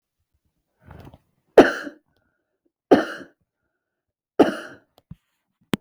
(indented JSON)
{
  "three_cough_length": "5.8 s",
  "three_cough_amplitude": 32768,
  "three_cough_signal_mean_std_ratio": 0.2,
  "survey_phase": "beta (2021-08-13 to 2022-03-07)",
  "age": "45-64",
  "gender": "Female",
  "wearing_mask": "No",
  "symptom_none": true,
  "symptom_onset": "12 days",
  "smoker_status": "Never smoked",
  "respiratory_condition_asthma": false,
  "respiratory_condition_other": false,
  "recruitment_source": "REACT",
  "submission_delay": "6 days",
  "covid_test_result": "Negative",
  "covid_test_method": "RT-qPCR"
}